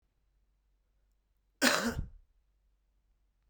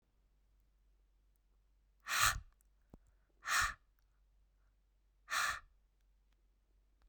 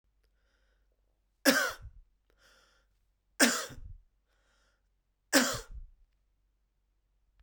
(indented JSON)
{
  "cough_length": "3.5 s",
  "cough_amplitude": 8722,
  "cough_signal_mean_std_ratio": 0.27,
  "exhalation_length": "7.1 s",
  "exhalation_amplitude": 4533,
  "exhalation_signal_mean_std_ratio": 0.29,
  "three_cough_length": "7.4 s",
  "three_cough_amplitude": 15880,
  "three_cough_signal_mean_std_ratio": 0.26,
  "survey_phase": "beta (2021-08-13 to 2022-03-07)",
  "age": "18-44",
  "gender": "Male",
  "wearing_mask": "No",
  "symptom_sore_throat": true,
  "symptom_fatigue": true,
  "symptom_headache": true,
  "symptom_onset": "3 days",
  "smoker_status": "Current smoker (11 or more cigarettes per day)",
  "respiratory_condition_asthma": false,
  "respiratory_condition_other": false,
  "recruitment_source": "Test and Trace",
  "submission_delay": "2 days",
  "covid_test_result": "Positive",
  "covid_test_method": "ePCR"
}